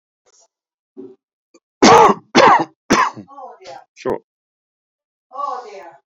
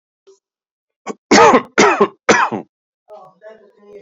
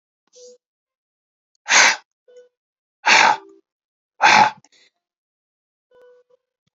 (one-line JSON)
{"cough_length": "6.1 s", "cough_amplitude": 30826, "cough_signal_mean_std_ratio": 0.34, "three_cough_length": "4.0 s", "three_cough_amplitude": 31491, "three_cough_signal_mean_std_ratio": 0.39, "exhalation_length": "6.7 s", "exhalation_amplitude": 30803, "exhalation_signal_mean_std_ratio": 0.29, "survey_phase": "beta (2021-08-13 to 2022-03-07)", "age": "65+", "gender": "Male", "wearing_mask": "No", "symptom_none": true, "smoker_status": "Ex-smoker", "respiratory_condition_asthma": false, "respiratory_condition_other": false, "recruitment_source": "REACT", "submission_delay": "7 days", "covid_test_result": "Negative", "covid_test_method": "RT-qPCR", "influenza_a_test_result": "Negative", "influenza_b_test_result": "Negative"}